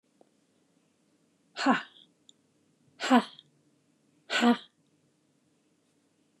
{
  "exhalation_length": "6.4 s",
  "exhalation_amplitude": 13527,
  "exhalation_signal_mean_std_ratio": 0.25,
  "survey_phase": "beta (2021-08-13 to 2022-03-07)",
  "age": "45-64",
  "gender": "Female",
  "wearing_mask": "No",
  "symptom_cough_any": true,
  "smoker_status": "Never smoked",
  "respiratory_condition_asthma": false,
  "respiratory_condition_other": false,
  "recruitment_source": "REACT",
  "submission_delay": "1 day",
  "covid_test_result": "Negative",
  "covid_test_method": "RT-qPCR",
  "influenza_a_test_result": "Negative",
  "influenza_b_test_result": "Negative"
}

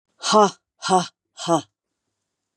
{
  "exhalation_length": "2.6 s",
  "exhalation_amplitude": 24003,
  "exhalation_signal_mean_std_ratio": 0.37,
  "survey_phase": "beta (2021-08-13 to 2022-03-07)",
  "age": "65+",
  "gender": "Female",
  "wearing_mask": "No",
  "symptom_cough_any": true,
  "symptom_runny_or_blocked_nose": true,
  "symptom_sore_throat": true,
  "symptom_headache": true,
  "smoker_status": "Never smoked",
  "respiratory_condition_asthma": false,
  "respiratory_condition_other": false,
  "recruitment_source": "Test and Trace",
  "submission_delay": "1 day",
  "covid_test_result": "Negative",
  "covid_test_method": "RT-qPCR"
}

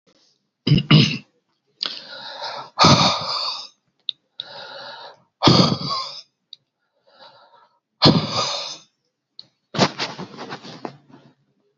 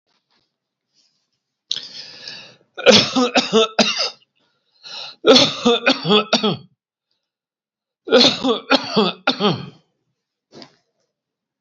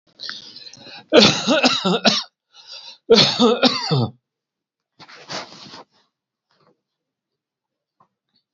{
  "exhalation_length": "11.8 s",
  "exhalation_amplitude": 32768,
  "exhalation_signal_mean_std_ratio": 0.38,
  "three_cough_length": "11.6 s",
  "three_cough_amplitude": 32768,
  "three_cough_signal_mean_std_ratio": 0.4,
  "cough_length": "8.5 s",
  "cough_amplitude": 31029,
  "cough_signal_mean_std_ratio": 0.38,
  "survey_phase": "beta (2021-08-13 to 2022-03-07)",
  "age": "65+",
  "gender": "Male",
  "wearing_mask": "No",
  "symptom_none": true,
  "smoker_status": "Current smoker (1 to 10 cigarettes per day)",
  "respiratory_condition_asthma": false,
  "respiratory_condition_other": false,
  "recruitment_source": "REACT",
  "submission_delay": "3 days",
  "covid_test_result": "Negative",
  "covid_test_method": "RT-qPCR"
}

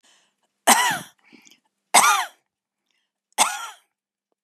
{
  "three_cough_length": "4.4 s",
  "three_cough_amplitude": 31519,
  "three_cough_signal_mean_std_ratio": 0.32,
  "survey_phase": "beta (2021-08-13 to 2022-03-07)",
  "age": "65+",
  "gender": "Female",
  "wearing_mask": "No",
  "symptom_none": true,
  "smoker_status": "Never smoked",
  "respiratory_condition_asthma": false,
  "respiratory_condition_other": false,
  "recruitment_source": "REACT",
  "submission_delay": "2 days",
  "covid_test_result": "Negative",
  "covid_test_method": "RT-qPCR",
  "influenza_a_test_result": "Negative",
  "influenza_b_test_result": "Negative"
}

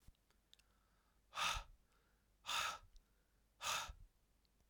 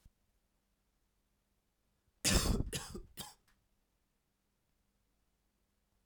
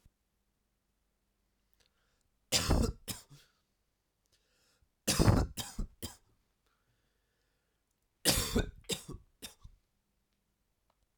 {
  "exhalation_length": "4.7 s",
  "exhalation_amplitude": 1605,
  "exhalation_signal_mean_std_ratio": 0.39,
  "cough_length": "6.1 s",
  "cough_amplitude": 5404,
  "cough_signal_mean_std_ratio": 0.25,
  "three_cough_length": "11.2 s",
  "three_cough_amplitude": 10340,
  "three_cough_signal_mean_std_ratio": 0.28,
  "survey_phase": "alpha (2021-03-01 to 2021-08-12)",
  "age": "18-44",
  "gender": "Male",
  "wearing_mask": "No",
  "symptom_cough_any": true,
  "symptom_new_continuous_cough": true,
  "symptom_onset": "4 days",
  "smoker_status": "Never smoked",
  "respiratory_condition_asthma": false,
  "respiratory_condition_other": false,
  "recruitment_source": "Test and Trace",
  "submission_delay": "1 day",
  "covid_test_result": "Positive",
  "covid_test_method": "RT-qPCR",
  "covid_ct_value": 14.5,
  "covid_ct_gene": "ORF1ab gene",
  "covid_ct_mean": 14.7,
  "covid_viral_load": "15000000 copies/ml",
  "covid_viral_load_category": "High viral load (>1M copies/ml)"
}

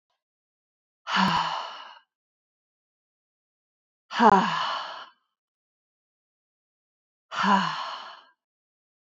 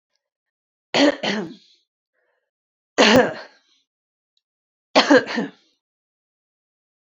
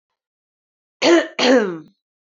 {
  "exhalation_length": "9.1 s",
  "exhalation_amplitude": 20971,
  "exhalation_signal_mean_std_ratio": 0.33,
  "three_cough_length": "7.2 s",
  "three_cough_amplitude": 27446,
  "three_cough_signal_mean_std_ratio": 0.3,
  "cough_length": "2.2 s",
  "cough_amplitude": 26327,
  "cough_signal_mean_std_ratio": 0.43,
  "survey_phase": "alpha (2021-03-01 to 2021-08-12)",
  "age": "18-44",
  "gender": "Female",
  "wearing_mask": "No",
  "symptom_none": true,
  "smoker_status": "Never smoked",
  "respiratory_condition_asthma": false,
  "respiratory_condition_other": false,
  "recruitment_source": "Test and Trace",
  "submission_delay": "2 days",
  "covid_test_result": "Positive",
  "covid_test_method": "RT-qPCR"
}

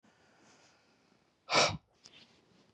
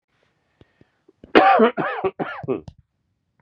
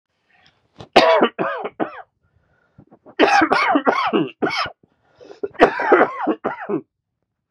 {
  "exhalation_length": "2.7 s",
  "exhalation_amplitude": 6483,
  "exhalation_signal_mean_std_ratio": 0.25,
  "cough_length": "3.4 s",
  "cough_amplitude": 32767,
  "cough_signal_mean_std_ratio": 0.37,
  "three_cough_length": "7.5 s",
  "three_cough_amplitude": 32768,
  "three_cough_signal_mean_std_ratio": 0.47,
  "survey_phase": "beta (2021-08-13 to 2022-03-07)",
  "age": "45-64",
  "gender": "Male",
  "wearing_mask": "No",
  "symptom_cough_any": true,
  "symptom_runny_or_blocked_nose": true,
  "symptom_shortness_of_breath": true,
  "symptom_fatigue": true,
  "symptom_fever_high_temperature": true,
  "symptom_headache": true,
  "symptom_change_to_sense_of_smell_or_taste": true,
  "symptom_other": true,
  "smoker_status": "Never smoked",
  "respiratory_condition_asthma": false,
  "respiratory_condition_other": false,
  "recruitment_source": "Test and Trace",
  "submission_delay": "2 days",
  "covid_test_result": "Positive",
  "covid_test_method": "LFT"
}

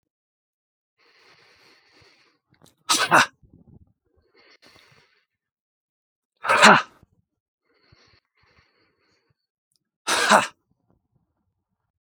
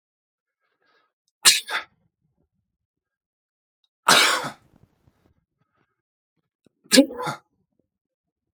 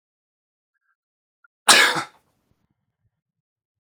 {
  "exhalation_length": "12.0 s",
  "exhalation_amplitude": 32768,
  "exhalation_signal_mean_std_ratio": 0.22,
  "three_cough_length": "8.5 s",
  "three_cough_amplitude": 32768,
  "three_cough_signal_mean_std_ratio": 0.23,
  "cough_length": "3.8 s",
  "cough_amplitude": 32768,
  "cough_signal_mean_std_ratio": 0.21,
  "survey_phase": "beta (2021-08-13 to 2022-03-07)",
  "age": "18-44",
  "gender": "Male",
  "wearing_mask": "No",
  "symptom_runny_or_blocked_nose": true,
  "symptom_fatigue": true,
  "symptom_onset": "7 days",
  "smoker_status": "Never smoked",
  "respiratory_condition_asthma": false,
  "respiratory_condition_other": false,
  "recruitment_source": "REACT",
  "submission_delay": "1 day",
  "covid_test_result": "Negative",
  "covid_test_method": "RT-qPCR"
}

